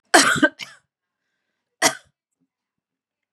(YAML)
cough_length: 3.3 s
cough_amplitude: 32767
cough_signal_mean_std_ratio: 0.27
survey_phase: beta (2021-08-13 to 2022-03-07)
age: 45-64
gender: Female
wearing_mask: 'No'
symptom_runny_or_blocked_nose: true
symptom_change_to_sense_of_smell_or_taste: true
symptom_loss_of_taste: true
smoker_status: Ex-smoker
respiratory_condition_asthma: false
respiratory_condition_other: false
recruitment_source: Test and Trace
submission_delay: 2 days
covid_test_result: Positive
covid_test_method: RT-qPCR
covid_ct_value: 16.8
covid_ct_gene: ORF1ab gene
covid_ct_mean: 17.9
covid_viral_load: 1300000 copies/ml
covid_viral_load_category: High viral load (>1M copies/ml)